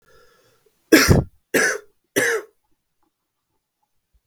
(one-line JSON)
{"three_cough_length": "4.3 s", "three_cough_amplitude": 32768, "three_cough_signal_mean_std_ratio": 0.32, "survey_phase": "beta (2021-08-13 to 2022-03-07)", "age": "18-44", "gender": "Male", "wearing_mask": "No", "symptom_fatigue": true, "symptom_onset": "10 days", "smoker_status": "Current smoker (11 or more cigarettes per day)", "respiratory_condition_asthma": false, "respiratory_condition_other": false, "recruitment_source": "REACT", "submission_delay": "2 days", "covid_test_result": "Negative", "covid_test_method": "RT-qPCR"}